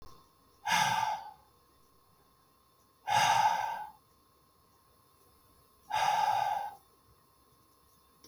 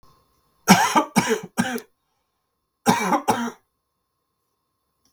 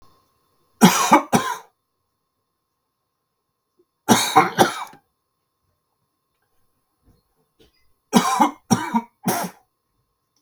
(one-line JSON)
{"exhalation_length": "8.3 s", "exhalation_amplitude": 6118, "exhalation_signal_mean_std_ratio": 0.44, "cough_length": "5.1 s", "cough_amplitude": 32768, "cough_signal_mean_std_ratio": 0.37, "three_cough_length": "10.4 s", "three_cough_amplitude": 32768, "three_cough_signal_mean_std_ratio": 0.31, "survey_phase": "beta (2021-08-13 to 2022-03-07)", "age": "45-64", "gender": "Male", "wearing_mask": "No", "symptom_cough_any": true, "symptom_sore_throat": true, "symptom_fever_high_temperature": true, "symptom_onset": "5 days", "smoker_status": "Never smoked", "respiratory_condition_asthma": false, "respiratory_condition_other": false, "recruitment_source": "Test and Trace", "submission_delay": "3 days", "covid_test_result": "Positive", "covid_test_method": "RT-qPCR", "covid_ct_value": 17.8, "covid_ct_gene": "N gene", "covid_ct_mean": 18.2, "covid_viral_load": "1100000 copies/ml", "covid_viral_load_category": "High viral load (>1M copies/ml)"}